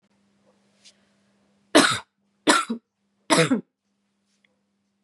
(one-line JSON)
{"three_cough_length": "5.0 s", "three_cough_amplitude": 27068, "three_cough_signal_mean_std_ratio": 0.29, "survey_phase": "beta (2021-08-13 to 2022-03-07)", "age": "18-44", "gender": "Female", "wearing_mask": "No", "symptom_runny_or_blocked_nose": true, "symptom_sore_throat": true, "symptom_other": true, "symptom_onset": "8 days", "smoker_status": "Never smoked", "respiratory_condition_asthma": false, "respiratory_condition_other": false, "recruitment_source": "Test and Trace", "submission_delay": "2 days", "covid_test_result": "Positive", "covid_test_method": "RT-qPCR", "covid_ct_value": 17.3, "covid_ct_gene": "ORF1ab gene", "covid_ct_mean": 17.5, "covid_viral_load": "1800000 copies/ml", "covid_viral_load_category": "High viral load (>1M copies/ml)"}